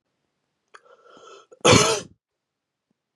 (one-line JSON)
{"cough_length": "3.2 s", "cough_amplitude": 27082, "cough_signal_mean_std_ratio": 0.26, "survey_phase": "beta (2021-08-13 to 2022-03-07)", "age": "18-44", "gender": "Male", "wearing_mask": "No", "symptom_runny_or_blocked_nose": true, "symptom_headache": true, "smoker_status": "Never smoked", "respiratory_condition_asthma": false, "respiratory_condition_other": false, "recruitment_source": "Test and Trace", "submission_delay": "2 days", "covid_test_result": "Positive", "covid_test_method": "RT-qPCR", "covid_ct_value": 21.9, "covid_ct_gene": "N gene"}